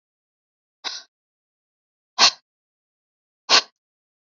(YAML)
exhalation_length: 4.3 s
exhalation_amplitude: 32598
exhalation_signal_mean_std_ratio: 0.19
survey_phase: alpha (2021-03-01 to 2021-08-12)
age: 45-64
gender: Female
wearing_mask: 'No'
symptom_none: true
symptom_onset: 3 days
smoker_status: Never smoked
respiratory_condition_asthma: false
respiratory_condition_other: false
recruitment_source: REACT
submission_delay: 3 days
covid_test_result: Negative
covid_test_method: RT-qPCR